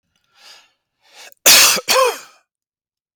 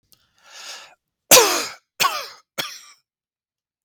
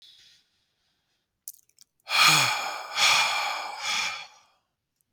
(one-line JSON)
{"cough_length": "3.2 s", "cough_amplitude": 32768, "cough_signal_mean_std_ratio": 0.37, "three_cough_length": "3.8 s", "three_cough_amplitude": 32768, "three_cough_signal_mean_std_ratio": 0.29, "exhalation_length": "5.1 s", "exhalation_amplitude": 16604, "exhalation_signal_mean_std_ratio": 0.47, "survey_phase": "beta (2021-08-13 to 2022-03-07)", "age": "18-44", "gender": "Male", "wearing_mask": "No", "symptom_none": true, "smoker_status": "Current smoker (1 to 10 cigarettes per day)", "respiratory_condition_asthma": false, "respiratory_condition_other": false, "recruitment_source": "REACT", "submission_delay": "1 day", "covid_test_result": "Negative", "covid_test_method": "RT-qPCR", "influenza_a_test_result": "Negative", "influenza_b_test_result": "Negative"}